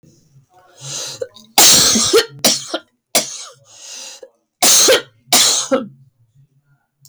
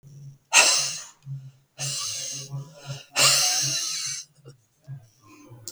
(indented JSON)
{
  "cough_length": "7.1 s",
  "cough_amplitude": 32768,
  "cough_signal_mean_std_ratio": 0.48,
  "exhalation_length": "5.7 s",
  "exhalation_amplitude": 28793,
  "exhalation_signal_mean_std_ratio": 0.5,
  "survey_phase": "beta (2021-08-13 to 2022-03-07)",
  "age": "45-64",
  "gender": "Female",
  "wearing_mask": "No",
  "symptom_none": true,
  "smoker_status": "Never smoked",
  "respiratory_condition_asthma": false,
  "respiratory_condition_other": true,
  "recruitment_source": "REACT",
  "submission_delay": "5 days",
  "covid_test_result": "Negative",
  "covid_test_method": "RT-qPCR",
  "influenza_a_test_result": "Unknown/Void",
  "influenza_b_test_result": "Unknown/Void"
}